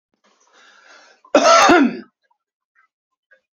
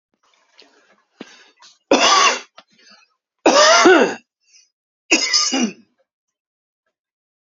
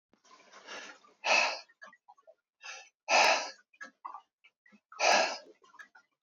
cough_length: 3.6 s
cough_amplitude: 30687
cough_signal_mean_std_ratio: 0.34
three_cough_length: 7.5 s
three_cough_amplitude: 30996
three_cough_signal_mean_std_ratio: 0.38
exhalation_length: 6.2 s
exhalation_amplitude: 8760
exhalation_signal_mean_std_ratio: 0.36
survey_phase: beta (2021-08-13 to 2022-03-07)
age: 45-64
gender: Male
wearing_mask: 'No'
symptom_none: true
smoker_status: Never smoked
respiratory_condition_asthma: false
respiratory_condition_other: false
recruitment_source: REACT
submission_delay: 0 days
covid_test_result: Negative
covid_test_method: RT-qPCR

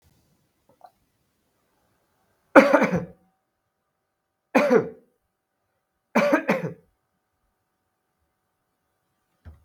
three_cough_length: 9.6 s
three_cough_amplitude: 32768
three_cough_signal_mean_std_ratio: 0.25
survey_phase: beta (2021-08-13 to 2022-03-07)
age: 65+
gender: Male
wearing_mask: 'No'
symptom_cough_any: true
symptom_runny_or_blocked_nose: true
smoker_status: Never smoked
respiratory_condition_asthma: false
respiratory_condition_other: false
recruitment_source: Test and Trace
submission_delay: 1 day
covid_test_result: Positive
covid_test_method: RT-qPCR
covid_ct_value: 19.6
covid_ct_gene: ORF1ab gene
covid_ct_mean: 20.1
covid_viral_load: 250000 copies/ml
covid_viral_load_category: Low viral load (10K-1M copies/ml)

